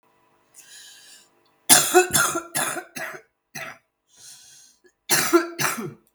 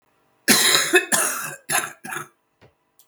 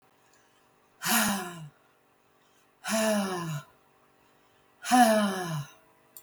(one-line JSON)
{"three_cough_length": "6.1 s", "three_cough_amplitude": 32768, "three_cough_signal_mean_std_ratio": 0.38, "cough_length": "3.1 s", "cough_amplitude": 32768, "cough_signal_mean_std_ratio": 0.48, "exhalation_length": "6.2 s", "exhalation_amplitude": 11791, "exhalation_signal_mean_std_ratio": 0.45, "survey_phase": "beta (2021-08-13 to 2022-03-07)", "age": "45-64", "gender": "Female", "wearing_mask": "No", "symptom_none": true, "smoker_status": "Current smoker (11 or more cigarettes per day)", "respiratory_condition_asthma": false, "respiratory_condition_other": false, "recruitment_source": "Test and Trace", "submission_delay": "1 day", "covid_test_method": "ePCR"}